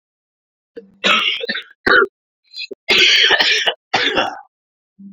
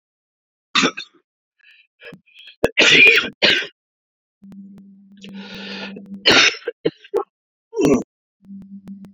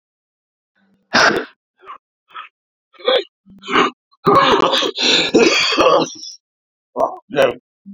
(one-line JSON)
{"cough_length": "5.1 s", "cough_amplitude": 29609, "cough_signal_mean_std_ratio": 0.52, "three_cough_length": "9.1 s", "three_cough_amplitude": 30759, "three_cough_signal_mean_std_ratio": 0.37, "exhalation_length": "7.9 s", "exhalation_amplitude": 32767, "exhalation_signal_mean_std_ratio": 0.5, "survey_phase": "beta (2021-08-13 to 2022-03-07)", "age": "45-64", "gender": "Male", "wearing_mask": "No", "symptom_cough_any": true, "symptom_runny_or_blocked_nose": true, "symptom_sore_throat": true, "symptom_fatigue": true, "symptom_headache": true, "symptom_change_to_sense_of_smell_or_taste": true, "symptom_onset": "4 days", "smoker_status": "Ex-smoker", "respiratory_condition_asthma": false, "respiratory_condition_other": false, "recruitment_source": "Test and Trace", "submission_delay": "2 days", "covid_test_result": "Positive", "covid_test_method": "RT-qPCR", "covid_ct_value": 17.5, "covid_ct_gene": "ORF1ab gene", "covid_ct_mean": 18.6, "covid_viral_load": "820000 copies/ml", "covid_viral_load_category": "Low viral load (10K-1M copies/ml)"}